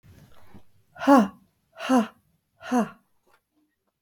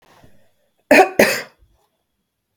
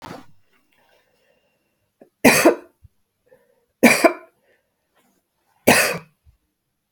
{"exhalation_length": "4.0 s", "exhalation_amplitude": 16523, "exhalation_signal_mean_std_ratio": 0.33, "cough_length": "2.6 s", "cough_amplitude": 32768, "cough_signal_mean_std_ratio": 0.29, "three_cough_length": "6.9 s", "three_cough_amplitude": 32768, "three_cough_signal_mean_std_ratio": 0.27, "survey_phase": "beta (2021-08-13 to 2022-03-07)", "age": "65+", "gender": "Female", "wearing_mask": "No", "symptom_none": true, "smoker_status": "Ex-smoker", "respiratory_condition_asthma": false, "respiratory_condition_other": false, "recruitment_source": "REACT", "submission_delay": "1 day", "covid_test_result": "Negative", "covid_test_method": "RT-qPCR", "influenza_a_test_result": "Negative", "influenza_b_test_result": "Negative"}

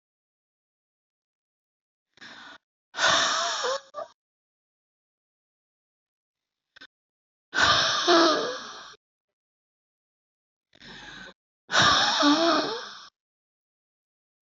{"exhalation_length": "14.5 s", "exhalation_amplitude": 18929, "exhalation_signal_mean_std_ratio": 0.37, "survey_phase": "beta (2021-08-13 to 2022-03-07)", "age": "18-44", "gender": "Female", "wearing_mask": "No", "symptom_runny_or_blocked_nose": true, "symptom_sore_throat": true, "symptom_fatigue": true, "symptom_other": true, "symptom_onset": "3 days", "smoker_status": "Never smoked", "respiratory_condition_asthma": false, "respiratory_condition_other": false, "recruitment_source": "Test and Trace", "submission_delay": "2 days", "covid_test_result": "Positive", "covid_test_method": "RT-qPCR", "covid_ct_value": 25.7, "covid_ct_gene": "N gene", "covid_ct_mean": 25.7, "covid_viral_load": "3600 copies/ml", "covid_viral_load_category": "Minimal viral load (< 10K copies/ml)"}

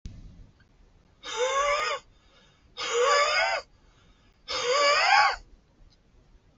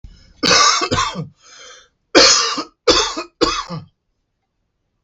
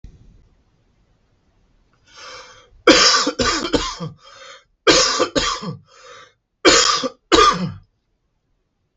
{"exhalation_length": "6.6 s", "exhalation_amplitude": 14461, "exhalation_signal_mean_std_ratio": 0.53, "cough_length": "5.0 s", "cough_amplitude": 32768, "cough_signal_mean_std_ratio": 0.47, "three_cough_length": "9.0 s", "three_cough_amplitude": 32768, "three_cough_signal_mean_std_ratio": 0.41, "survey_phase": "beta (2021-08-13 to 2022-03-07)", "age": "45-64", "gender": "Male", "wearing_mask": "No", "symptom_cough_any": true, "symptom_fatigue": true, "symptom_loss_of_taste": true, "symptom_onset": "8 days", "smoker_status": "Never smoked", "respiratory_condition_asthma": false, "respiratory_condition_other": false, "recruitment_source": "REACT", "submission_delay": "2 days", "covid_test_result": "Negative", "covid_test_method": "RT-qPCR", "influenza_a_test_result": "Negative", "influenza_b_test_result": "Negative"}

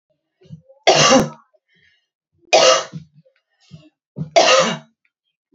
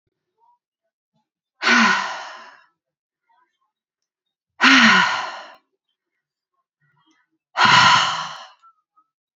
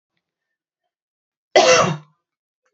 {"three_cough_length": "5.5 s", "three_cough_amplitude": 31809, "three_cough_signal_mean_std_ratio": 0.38, "exhalation_length": "9.4 s", "exhalation_amplitude": 29278, "exhalation_signal_mean_std_ratio": 0.35, "cough_length": "2.7 s", "cough_amplitude": 28084, "cough_signal_mean_std_ratio": 0.3, "survey_phase": "beta (2021-08-13 to 2022-03-07)", "age": "18-44", "gender": "Female", "wearing_mask": "No", "symptom_none": true, "smoker_status": "Current smoker (1 to 10 cigarettes per day)", "recruitment_source": "REACT", "submission_delay": "3 days", "covid_test_result": "Negative", "covid_test_method": "RT-qPCR", "influenza_a_test_result": "Negative", "influenza_b_test_result": "Negative"}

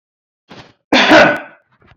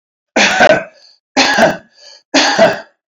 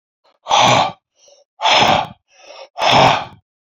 {"cough_length": "2.0 s", "cough_amplitude": 32767, "cough_signal_mean_std_ratio": 0.42, "three_cough_length": "3.1 s", "three_cough_amplitude": 31541, "three_cough_signal_mean_std_ratio": 0.57, "exhalation_length": "3.8 s", "exhalation_amplitude": 32768, "exhalation_signal_mean_std_ratio": 0.51, "survey_phase": "beta (2021-08-13 to 2022-03-07)", "age": "65+", "gender": "Male", "wearing_mask": "No", "symptom_none": true, "smoker_status": "Ex-smoker", "respiratory_condition_asthma": false, "respiratory_condition_other": false, "recruitment_source": "REACT", "submission_delay": "2 days", "covid_test_result": "Negative", "covid_test_method": "RT-qPCR"}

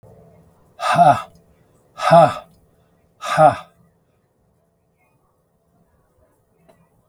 {"exhalation_length": "7.1 s", "exhalation_amplitude": 32768, "exhalation_signal_mean_std_ratio": 0.28, "survey_phase": "beta (2021-08-13 to 2022-03-07)", "age": "65+", "gender": "Male", "wearing_mask": "No", "symptom_none": true, "smoker_status": "Ex-smoker", "respiratory_condition_asthma": false, "respiratory_condition_other": false, "recruitment_source": "REACT", "submission_delay": "2 days", "covid_test_result": "Negative", "covid_test_method": "RT-qPCR", "influenza_a_test_result": "Negative", "influenza_b_test_result": "Negative"}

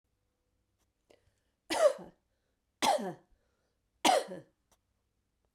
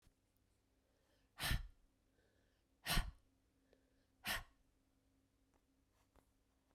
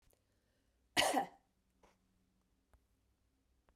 {"three_cough_length": "5.5 s", "three_cough_amplitude": 9037, "three_cough_signal_mean_std_ratio": 0.28, "exhalation_length": "6.7 s", "exhalation_amplitude": 2400, "exhalation_signal_mean_std_ratio": 0.25, "cough_length": "3.8 s", "cough_amplitude": 4841, "cough_signal_mean_std_ratio": 0.23, "survey_phase": "beta (2021-08-13 to 2022-03-07)", "age": "45-64", "gender": "Female", "wearing_mask": "No", "symptom_sore_throat": true, "symptom_fatigue": true, "symptom_headache": true, "symptom_change_to_sense_of_smell_or_taste": true, "symptom_loss_of_taste": true, "symptom_onset": "5 days", "smoker_status": "Never smoked", "respiratory_condition_asthma": true, "respiratory_condition_other": false, "recruitment_source": "Test and Trace", "submission_delay": "2 days", "covid_test_result": "Positive", "covid_test_method": "RT-qPCR", "covid_ct_value": 17.0, "covid_ct_gene": "ORF1ab gene", "covid_ct_mean": 17.5, "covid_viral_load": "1800000 copies/ml", "covid_viral_load_category": "High viral load (>1M copies/ml)"}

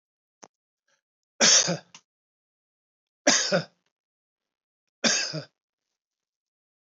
{"three_cough_length": "6.9 s", "three_cough_amplitude": 16496, "three_cough_signal_mean_std_ratio": 0.28, "survey_phase": "beta (2021-08-13 to 2022-03-07)", "age": "65+", "gender": "Male", "wearing_mask": "No", "symptom_none": true, "smoker_status": "Never smoked", "respiratory_condition_asthma": false, "respiratory_condition_other": false, "recruitment_source": "REACT", "submission_delay": "5 days", "covid_test_result": "Negative", "covid_test_method": "RT-qPCR", "influenza_a_test_result": "Negative", "influenza_b_test_result": "Negative"}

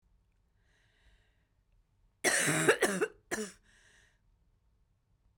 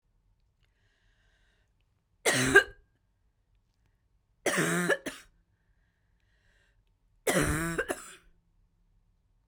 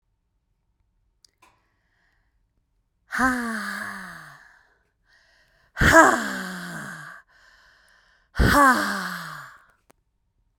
{"cough_length": "5.4 s", "cough_amplitude": 8206, "cough_signal_mean_std_ratio": 0.32, "three_cough_length": "9.5 s", "three_cough_amplitude": 19023, "three_cough_signal_mean_std_ratio": 0.3, "exhalation_length": "10.6 s", "exhalation_amplitude": 32767, "exhalation_signal_mean_std_ratio": 0.34, "survey_phase": "beta (2021-08-13 to 2022-03-07)", "age": "45-64", "gender": "Female", "wearing_mask": "No", "symptom_cough_any": true, "symptom_runny_or_blocked_nose": true, "symptom_sore_throat": true, "symptom_onset": "8 days", "smoker_status": "Never smoked", "respiratory_condition_asthma": false, "respiratory_condition_other": false, "recruitment_source": "REACT", "submission_delay": "2 days", "covid_test_result": "Negative", "covid_test_method": "RT-qPCR", "influenza_a_test_result": "Negative", "influenza_b_test_result": "Negative"}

